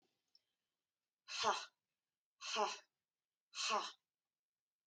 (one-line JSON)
{"exhalation_length": "4.9 s", "exhalation_amplitude": 2528, "exhalation_signal_mean_std_ratio": 0.34, "survey_phase": "alpha (2021-03-01 to 2021-08-12)", "age": "45-64", "gender": "Female", "wearing_mask": "No", "symptom_none": true, "smoker_status": "Never smoked", "respiratory_condition_asthma": false, "respiratory_condition_other": false, "recruitment_source": "REACT", "submission_delay": "2 days", "covid_test_result": "Negative", "covid_test_method": "RT-qPCR"}